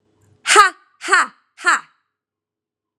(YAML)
exhalation_length: 3.0 s
exhalation_amplitude: 32768
exhalation_signal_mean_std_ratio: 0.32
survey_phase: beta (2021-08-13 to 2022-03-07)
age: 18-44
gender: Female
wearing_mask: 'No'
symptom_headache: true
symptom_onset: 2 days
smoker_status: Never smoked
respiratory_condition_asthma: false
respiratory_condition_other: false
recruitment_source: Test and Trace
submission_delay: 2 days
covid_test_result: Positive
covid_test_method: RT-qPCR
covid_ct_value: 32.4
covid_ct_gene: ORF1ab gene
covid_ct_mean: 33.3
covid_viral_load: 12 copies/ml
covid_viral_load_category: Minimal viral load (< 10K copies/ml)